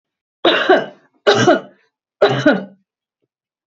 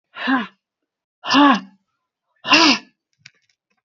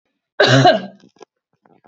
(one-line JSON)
{"three_cough_length": "3.7 s", "three_cough_amplitude": 30543, "three_cough_signal_mean_std_ratio": 0.44, "exhalation_length": "3.8 s", "exhalation_amplitude": 32377, "exhalation_signal_mean_std_ratio": 0.37, "cough_length": "1.9 s", "cough_amplitude": 29311, "cough_signal_mean_std_ratio": 0.39, "survey_phase": "beta (2021-08-13 to 2022-03-07)", "age": "45-64", "gender": "Female", "wearing_mask": "No", "symptom_none": true, "smoker_status": "Ex-smoker", "respiratory_condition_asthma": false, "respiratory_condition_other": false, "recruitment_source": "Test and Trace", "submission_delay": "1 day", "covid_test_result": "Negative", "covid_test_method": "RT-qPCR"}